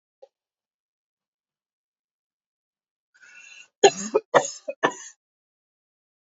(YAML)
three_cough_length: 6.4 s
three_cough_amplitude: 28184
three_cough_signal_mean_std_ratio: 0.18
survey_phase: alpha (2021-03-01 to 2021-08-12)
age: 45-64
gender: Female
wearing_mask: 'No'
symptom_none: true
smoker_status: Never smoked
respiratory_condition_asthma: false
respiratory_condition_other: false
recruitment_source: REACT
submission_delay: 1 day
covid_test_result: Negative
covid_test_method: RT-qPCR